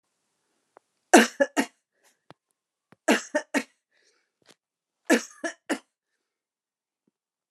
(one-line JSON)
{"three_cough_length": "7.5 s", "three_cough_amplitude": 29057, "three_cough_signal_mean_std_ratio": 0.22, "survey_phase": "alpha (2021-03-01 to 2021-08-12)", "age": "65+", "gender": "Female", "wearing_mask": "No", "symptom_none": true, "smoker_status": "Ex-smoker", "respiratory_condition_asthma": false, "respiratory_condition_other": false, "recruitment_source": "REACT", "submission_delay": "3 days", "covid_test_result": "Negative", "covid_test_method": "RT-qPCR"}